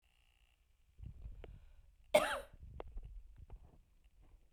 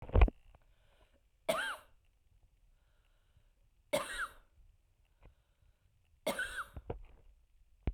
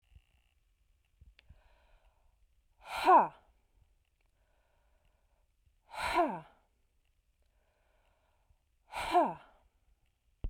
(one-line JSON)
{"cough_length": "4.5 s", "cough_amplitude": 5502, "cough_signal_mean_std_ratio": 0.31, "three_cough_length": "7.9 s", "three_cough_amplitude": 7111, "three_cough_signal_mean_std_ratio": 0.26, "exhalation_length": "10.5 s", "exhalation_amplitude": 7396, "exhalation_signal_mean_std_ratio": 0.24, "survey_phase": "beta (2021-08-13 to 2022-03-07)", "age": "45-64", "gender": "Female", "wearing_mask": "No", "symptom_none": true, "smoker_status": "Never smoked", "respiratory_condition_asthma": false, "respiratory_condition_other": false, "recruitment_source": "REACT", "submission_delay": "1 day", "covid_test_result": "Negative", "covid_test_method": "RT-qPCR"}